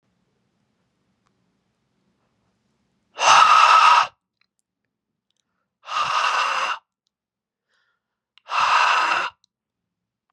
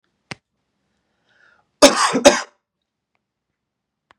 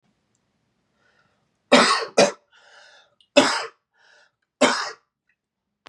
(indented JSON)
{
  "exhalation_length": "10.3 s",
  "exhalation_amplitude": 30526,
  "exhalation_signal_mean_std_ratio": 0.38,
  "cough_length": "4.2 s",
  "cough_amplitude": 32768,
  "cough_signal_mean_std_ratio": 0.24,
  "three_cough_length": "5.9 s",
  "three_cough_amplitude": 32133,
  "three_cough_signal_mean_std_ratio": 0.3,
  "survey_phase": "beta (2021-08-13 to 2022-03-07)",
  "age": "18-44",
  "gender": "Male",
  "wearing_mask": "No",
  "symptom_runny_or_blocked_nose": true,
  "symptom_onset": "5 days",
  "smoker_status": "Never smoked",
  "respiratory_condition_asthma": false,
  "respiratory_condition_other": false,
  "recruitment_source": "REACT",
  "submission_delay": "2 days",
  "covid_test_result": "Positive",
  "covid_test_method": "RT-qPCR",
  "covid_ct_value": 22.6,
  "covid_ct_gene": "E gene",
  "influenza_a_test_result": "Negative",
  "influenza_b_test_result": "Negative"
}